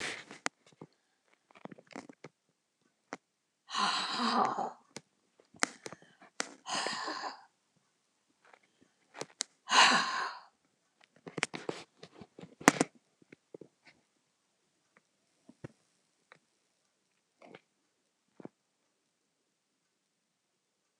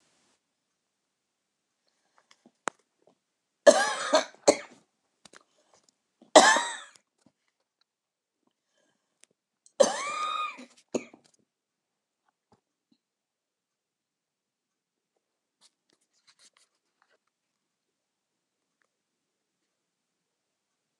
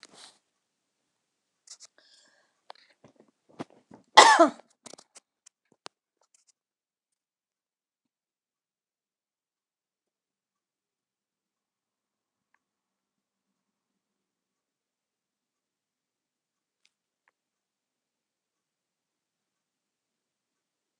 exhalation_length: 21.0 s
exhalation_amplitude: 29203
exhalation_signal_mean_std_ratio: 0.25
three_cough_length: 21.0 s
three_cough_amplitude: 27486
three_cough_signal_mean_std_ratio: 0.17
cough_length: 21.0 s
cough_amplitude: 29204
cough_signal_mean_std_ratio: 0.09
survey_phase: beta (2021-08-13 to 2022-03-07)
age: 65+
gender: Female
wearing_mask: 'No'
symptom_shortness_of_breath: true
smoker_status: Never smoked
respiratory_condition_asthma: false
respiratory_condition_other: true
recruitment_source: REACT
submission_delay: 2 days
covid_test_result: Negative
covid_test_method: RT-qPCR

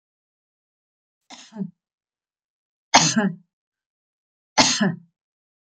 three_cough_length: 5.7 s
three_cough_amplitude: 32554
three_cough_signal_mean_std_ratio: 0.28
survey_phase: beta (2021-08-13 to 2022-03-07)
age: 65+
gender: Female
wearing_mask: 'No'
symptom_none: true
smoker_status: Ex-smoker
respiratory_condition_asthma: false
respiratory_condition_other: false
recruitment_source: REACT
submission_delay: 15 days
covid_test_result: Negative
covid_test_method: RT-qPCR
influenza_a_test_result: Negative
influenza_b_test_result: Negative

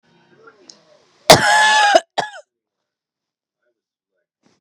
cough_length: 4.6 s
cough_amplitude: 32768
cough_signal_mean_std_ratio: 0.31
survey_phase: beta (2021-08-13 to 2022-03-07)
age: 18-44
gender: Female
wearing_mask: 'No'
symptom_runny_or_blocked_nose: true
symptom_onset: 5 days
smoker_status: Never smoked
respiratory_condition_asthma: false
respiratory_condition_other: false
recruitment_source: REACT
submission_delay: 4 days
covid_test_result: Negative
covid_test_method: RT-qPCR
influenza_a_test_result: Negative
influenza_b_test_result: Negative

